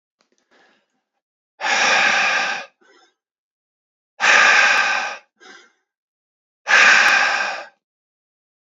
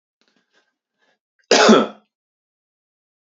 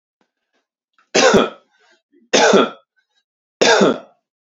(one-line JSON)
{"exhalation_length": "8.8 s", "exhalation_amplitude": 28999, "exhalation_signal_mean_std_ratio": 0.46, "cough_length": "3.2 s", "cough_amplitude": 32111, "cough_signal_mean_std_ratio": 0.26, "three_cough_length": "4.5 s", "three_cough_amplitude": 32395, "three_cough_signal_mean_std_ratio": 0.4, "survey_phase": "beta (2021-08-13 to 2022-03-07)", "age": "18-44", "gender": "Male", "wearing_mask": "No", "symptom_cough_any": true, "symptom_runny_or_blocked_nose": true, "symptom_sore_throat": true, "symptom_onset": "4 days", "smoker_status": "Ex-smoker", "respiratory_condition_asthma": false, "respiratory_condition_other": false, "recruitment_source": "Test and Trace", "submission_delay": "1 day", "covid_test_result": "Negative", "covid_test_method": "RT-qPCR"}